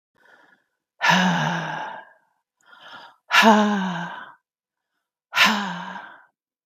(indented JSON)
{
  "exhalation_length": "6.7 s",
  "exhalation_amplitude": 26617,
  "exhalation_signal_mean_std_ratio": 0.44,
  "survey_phase": "beta (2021-08-13 to 2022-03-07)",
  "age": "45-64",
  "gender": "Female",
  "wearing_mask": "No",
  "symptom_none": true,
  "smoker_status": "Never smoked",
  "respiratory_condition_asthma": false,
  "respiratory_condition_other": false,
  "recruitment_source": "REACT",
  "submission_delay": "1 day",
  "covid_test_result": "Negative",
  "covid_test_method": "RT-qPCR",
  "influenza_a_test_result": "Negative",
  "influenza_b_test_result": "Negative"
}